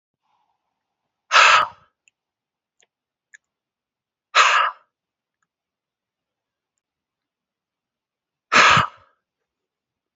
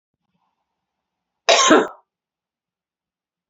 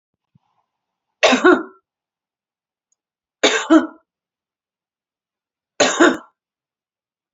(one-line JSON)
{"exhalation_length": "10.2 s", "exhalation_amplitude": 29432, "exhalation_signal_mean_std_ratio": 0.25, "cough_length": "3.5 s", "cough_amplitude": 30189, "cough_signal_mean_std_ratio": 0.26, "three_cough_length": "7.3 s", "three_cough_amplitude": 32767, "three_cough_signal_mean_std_ratio": 0.29, "survey_phase": "beta (2021-08-13 to 2022-03-07)", "age": "18-44", "gender": "Female", "wearing_mask": "No", "symptom_none": true, "smoker_status": "Never smoked", "respiratory_condition_asthma": false, "respiratory_condition_other": false, "recruitment_source": "REACT", "submission_delay": "3 days", "covid_test_result": "Negative", "covid_test_method": "RT-qPCR", "influenza_a_test_result": "Negative", "influenza_b_test_result": "Negative"}